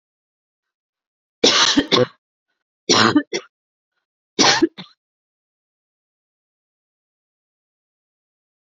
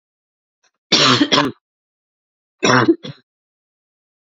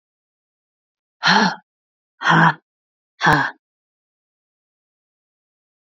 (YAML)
three_cough_length: 8.6 s
three_cough_amplitude: 32272
three_cough_signal_mean_std_ratio: 0.29
cough_length: 4.4 s
cough_amplitude: 32247
cough_signal_mean_std_ratio: 0.36
exhalation_length: 5.8 s
exhalation_amplitude: 29579
exhalation_signal_mean_std_ratio: 0.3
survey_phase: alpha (2021-03-01 to 2021-08-12)
age: 18-44
gender: Female
wearing_mask: 'No'
symptom_cough_any: true
symptom_fatigue: true
symptom_onset: 2 days
smoker_status: Never smoked
respiratory_condition_asthma: false
respiratory_condition_other: false
recruitment_source: Test and Trace
submission_delay: 2 days
covid_test_result: Positive
covid_test_method: RT-qPCR